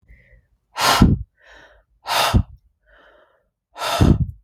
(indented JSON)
{
  "exhalation_length": "4.4 s",
  "exhalation_amplitude": 32767,
  "exhalation_signal_mean_std_ratio": 0.41,
  "survey_phase": "beta (2021-08-13 to 2022-03-07)",
  "age": "18-44",
  "gender": "Female",
  "wearing_mask": "No",
  "symptom_cough_any": true,
  "symptom_fatigue": true,
  "symptom_other": true,
  "smoker_status": "Ex-smoker",
  "respiratory_condition_asthma": false,
  "respiratory_condition_other": false,
  "recruitment_source": "REACT",
  "submission_delay": "1 day",
  "covid_test_result": "Negative",
  "covid_test_method": "RT-qPCR"
}